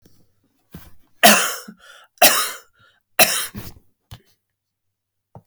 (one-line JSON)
{"three_cough_length": "5.5 s", "three_cough_amplitude": 32768, "three_cough_signal_mean_std_ratio": 0.3, "survey_phase": "alpha (2021-03-01 to 2021-08-12)", "age": "65+", "gender": "Male", "wearing_mask": "No", "symptom_none": true, "smoker_status": "Never smoked", "respiratory_condition_asthma": false, "respiratory_condition_other": false, "recruitment_source": "REACT", "submission_delay": "4 days", "covid_test_method": "RT-qPCR", "covid_ct_value": 35.0, "covid_ct_gene": "N gene"}